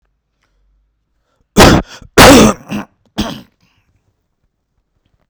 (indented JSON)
{
  "cough_length": "5.3 s",
  "cough_amplitude": 32768,
  "cough_signal_mean_std_ratio": 0.33,
  "survey_phase": "beta (2021-08-13 to 2022-03-07)",
  "age": "18-44",
  "gender": "Male",
  "wearing_mask": "No",
  "symptom_none": true,
  "smoker_status": "Ex-smoker",
  "respiratory_condition_asthma": false,
  "respiratory_condition_other": false,
  "recruitment_source": "REACT",
  "submission_delay": "22 days",
  "covid_test_result": "Negative",
  "covid_test_method": "RT-qPCR",
  "covid_ct_value": 46.0,
  "covid_ct_gene": "N gene"
}